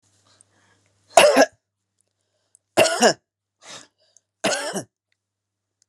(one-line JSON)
{"three_cough_length": "5.9 s", "three_cough_amplitude": 32768, "three_cough_signal_mean_std_ratio": 0.29, "survey_phase": "beta (2021-08-13 to 2022-03-07)", "age": "65+", "gender": "Female", "wearing_mask": "No", "symptom_none": true, "smoker_status": "Never smoked", "respiratory_condition_asthma": false, "respiratory_condition_other": false, "recruitment_source": "REACT", "submission_delay": "1 day", "covid_test_result": "Negative", "covid_test_method": "RT-qPCR"}